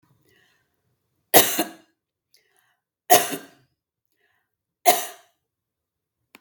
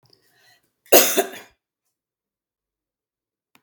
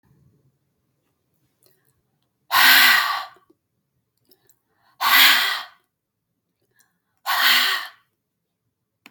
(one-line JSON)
{"three_cough_length": "6.4 s", "three_cough_amplitude": 32768, "three_cough_signal_mean_std_ratio": 0.22, "cough_length": "3.6 s", "cough_amplitude": 32768, "cough_signal_mean_std_ratio": 0.21, "exhalation_length": "9.1 s", "exhalation_amplitude": 32768, "exhalation_signal_mean_std_ratio": 0.35, "survey_phase": "beta (2021-08-13 to 2022-03-07)", "age": "45-64", "gender": "Female", "wearing_mask": "No", "symptom_none": true, "smoker_status": "Ex-smoker", "respiratory_condition_asthma": false, "respiratory_condition_other": false, "recruitment_source": "REACT", "submission_delay": "1 day", "covid_test_result": "Negative", "covid_test_method": "RT-qPCR"}